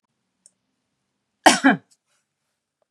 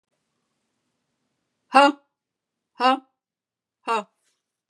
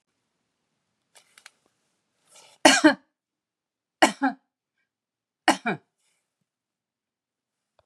{"cough_length": "2.9 s", "cough_amplitude": 32768, "cough_signal_mean_std_ratio": 0.21, "exhalation_length": "4.7 s", "exhalation_amplitude": 31279, "exhalation_signal_mean_std_ratio": 0.22, "three_cough_length": "7.9 s", "three_cough_amplitude": 32727, "three_cough_signal_mean_std_ratio": 0.2, "survey_phase": "beta (2021-08-13 to 2022-03-07)", "age": "65+", "gender": "Female", "wearing_mask": "No", "symptom_none": true, "smoker_status": "Never smoked", "respiratory_condition_asthma": false, "respiratory_condition_other": false, "recruitment_source": "REACT", "submission_delay": "1 day", "covid_test_result": "Negative", "covid_test_method": "RT-qPCR", "influenza_a_test_result": "Negative", "influenza_b_test_result": "Negative"}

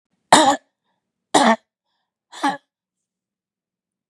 {"three_cough_length": "4.1 s", "three_cough_amplitude": 32768, "three_cough_signal_mean_std_ratio": 0.28, "survey_phase": "beta (2021-08-13 to 2022-03-07)", "age": "45-64", "gender": "Female", "wearing_mask": "Yes", "symptom_runny_or_blocked_nose": true, "symptom_sore_throat": true, "symptom_fatigue": true, "symptom_onset": "7 days", "smoker_status": "Never smoked", "respiratory_condition_asthma": false, "respiratory_condition_other": false, "recruitment_source": "Test and Trace", "submission_delay": "3 days", "covid_test_result": "Negative", "covid_test_method": "RT-qPCR"}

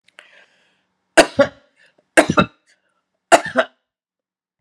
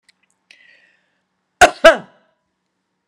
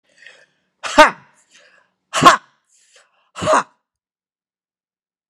{"three_cough_length": "4.6 s", "three_cough_amplitude": 32768, "three_cough_signal_mean_std_ratio": 0.25, "cough_length": "3.1 s", "cough_amplitude": 32768, "cough_signal_mean_std_ratio": 0.2, "exhalation_length": "5.3 s", "exhalation_amplitude": 32768, "exhalation_signal_mean_std_ratio": 0.24, "survey_phase": "beta (2021-08-13 to 2022-03-07)", "age": "65+", "gender": "Female", "wearing_mask": "No", "symptom_none": true, "smoker_status": "Ex-smoker", "respiratory_condition_asthma": false, "respiratory_condition_other": false, "recruitment_source": "REACT", "submission_delay": "1 day", "covid_test_result": "Negative", "covid_test_method": "RT-qPCR", "influenza_a_test_result": "Negative", "influenza_b_test_result": "Negative"}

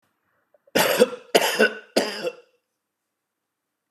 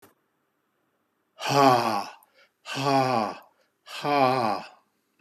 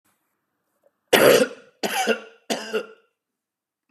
{"cough_length": "3.9 s", "cough_amplitude": 29531, "cough_signal_mean_std_ratio": 0.37, "exhalation_length": "5.2 s", "exhalation_amplitude": 18541, "exhalation_signal_mean_std_ratio": 0.46, "three_cough_length": "3.9 s", "three_cough_amplitude": 29982, "three_cough_signal_mean_std_ratio": 0.35, "survey_phase": "beta (2021-08-13 to 2022-03-07)", "age": "45-64", "gender": "Male", "wearing_mask": "No", "symptom_none": true, "smoker_status": "Never smoked", "respiratory_condition_asthma": false, "respiratory_condition_other": false, "recruitment_source": "REACT", "submission_delay": "1 day", "covid_test_result": "Negative", "covid_test_method": "RT-qPCR", "influenza_a_test_result": "Negative", "influenza_b_test_result": "Negative"}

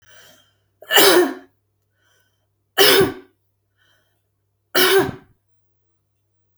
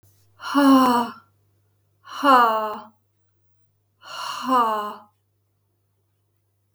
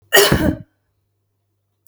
{"three_cough_length": "6.6 s", "three_cough_amplitude": 32768, "three_cough_signal_mean_std_ratio": 0.34, "exhalation_length": "6.7 s", "exhalation_amplitude": 27183, "exhalation_signal_mean_std_ratio": 0.4, "cough_length": "1.9 s", "cough_amplitude": 32768, "cough_signal_mean_std_ratio": 0.36, "survey_phase": "beta (2021-08-13 to 2022-03-07)", "age": "45-64", "gender": "Female", "wearing_mask": "No", "symptom_none": true, "smoker_status": "Never smoked", "respiratory_condition_asthma": true, "respiratory_condition_other": false, "recruitment_source": "REACT", "submission_delay": "2 days", "covid_test_result": "Negative", "covid_test_method": "RT-qPCR", "influenza_a_test_result": "Negative", "influenza_b_test_result": "Negative"}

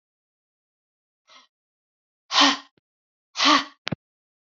{"exhalation_length": "4.5 s", "exhalation_amplitude": 24473, "exhalation_signal_mean_std_ratio": 0.26, "survey_phase": "beta (2021-08-13 to 2022-03-07)", "age": "45-64", "gender": "Female", "wearing_mask": "No", "symptom_none": true, "smoker_status": "Never smoked", "respiratory_condition_asthma": false, "respiratory_condition_other": false, "recruitment_source": "REACT", "submission_delay": "1 day", "covid_test_result": "Negative", "covid_test_method": "RT-qPCR", "influenza_a_test_result": "Negative", "influenza_b_test_result": "Negative"}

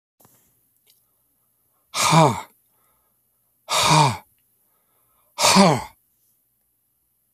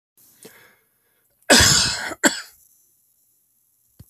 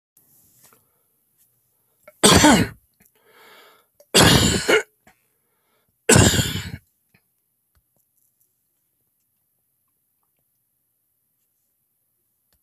{"exhalation_length": "7.3 s", "exhalation_amplitude": 27018, "exhalation_signal_mean_std_ratio": 0.33, "cough_length": "4.1 s", "cough_amplitude": 31731, "cough_signal_mean_std_ratio": 0.31, "three_cough_length": "12.6 s", "three_cough_amplitude": 32768, "three_cough_signal_mean_std_ratio": 0.27, "survey_phase": "beta (2021-08-13 to 2022-03-07)", "age": "65+", "gender": "Male", "wearing_mask": "No", "symptom_none": true, "smoker_status": "Never smoked", "respiratory_condition_asthma": false, "respiratory_condition_other": false, "recruitment_source": "REACT", "submission_delay": "2 days", "covid_test_result": "Negative", "covid_test_method": "RT-qPCR"}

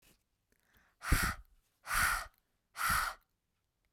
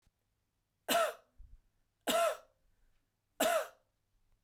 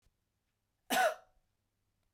{"exhalation_length": "3.9 s", "exhalation_amplitude": 5260, "exhalation_signal_mean_std_ratio": 0.41, "three_cough_length": "4.4 s", "three_cough_amplitude": 4800, "three_cough_signal_mean_std_ratio": 0.36, "cough_length": "2.1 s", "cough_amplitude": 3673, "cough_signal_mean_std_ratio": 0.27, "survey_phase": "beta (2021-08-13 to 2022-03-07)", "age": "18-44", "gender": "Female", "wearing_mask": "No", "symptom_none": true, "smoker_status": "Never smoked", "respiratory_condition_asthma": false, "respiratory_condition_other": false, "recruitment_source": "Test and Trace", "submission_delay": "2 days", "covid_test_result": "Negative", "covid_test_method": "RT-qPCR"}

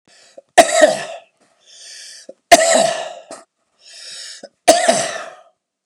{"three_cough_length": "5.9 s", "three_cough_amplitude": 32768, "three_cough_signal_mean_std_ratio": 0.38, "survey_phase": "beta (2021-08-13 to 2022-03-07)", "age": "45-64", "gender": "Male", "wearing_mask": "No", "symptom_none": true, "smoker_status": "Never smoked", "respiratory_condition_asthma": false, "respiratory_condition_other": false, "recruitment_source": "REACT", "submission_delay": "2 days", "covid_test_result": "Negative", "covid_test_method": "RT-qPCR", "influenza_a_test_result": "Unknown/Void", "influenza_b_test_result": "Unknown/Void"}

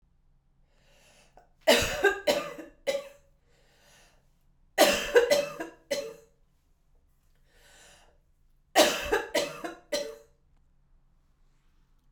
{"three_cough_length": "12.1 s", "three_cough_amplitude": 15470, "three_cough_signal_mean_std_ratio": 0.34, "survey_phase": "beta (2021-08-13 to 2022-03-07)", "age": "18-44", "gender": "Female", "wearing_mask": "No", "symptom_cough_any": true, "symptom_shortness_of_breath": true, "symptom_diarrhoea": true, "symptom_fatigue": true, "symptom_change_to_sense_of_smell_or_taste": true, "symptom_loss_of_taste": true, "symptom_other": true, "smoker_status": "Never smoked", "respiratory_condition_asthma": true, "respiratory_condition_other": false, "recruitment_source": "Test and Trace", "submission_delay": "2 days", "covid_test_result": "Positive", "covid_test_method": "RT-qPCR", "covid_ct_value": 20.1, "covid_ct_gene": "ORF1ab gene", "covid_ct_mean": 20.3, "covid_viral_load": "210000 copies/ml", "covid_viral_load_category": "Low viral load (10K-1M copies/ml)"}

